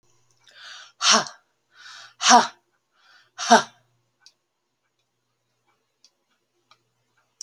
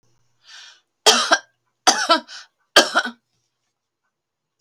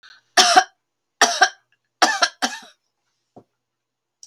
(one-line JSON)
{"exhalation_length": "7.4 s", "exhalation_amplitude": 31857, "exhalation_signal_mean_std_ratio": 0.23, "three_cough_length": "4.6 s", "three_cough_amplitude": 32561, "three_cough_signal_mean_std_ratio": 0.31, "cough_length": "4.3 s", "cough_amplitude": 31908, "cough_signal_mean_std_ratio": 0.32, "survey_phase": "alpha (2021-03-01 to 2021-08-12)", "age": "65+", "gender": "Female", "wearing_mask": "No", "symptom_none": true, "smoker_status": "Never smoked", "respiratory_condition_asthma": false, "respiratory_condition_other": false, "recruitment_source": "REACT", "submission_delay": "2 days", "covid_test_result": "Negative", "covid_test_method": "RT-qPCR"}